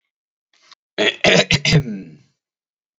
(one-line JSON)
{"cough_length": "3.0 s", "cough_amplitude": 30292, "cough_signal_mean_std_ratio": 0.39, "survey_phase": "beta (2021-08-13 to 2022-03-07)", "age": "18-44", "gender": "Male", "wearing_mask": "No", "symptom_none": true, "smoker_status": "Never smoked", "respiratory_condition_asthma": false, "respiratory_condition_other": false, "recruitment_source": "REACT", "submission_delay": "1 day", "covid_test_result": "Negative", "covid_test_method": "RT-qPCR", "influenza_a_test_result": "Negative", "influenza_b_test_result": "Negative"}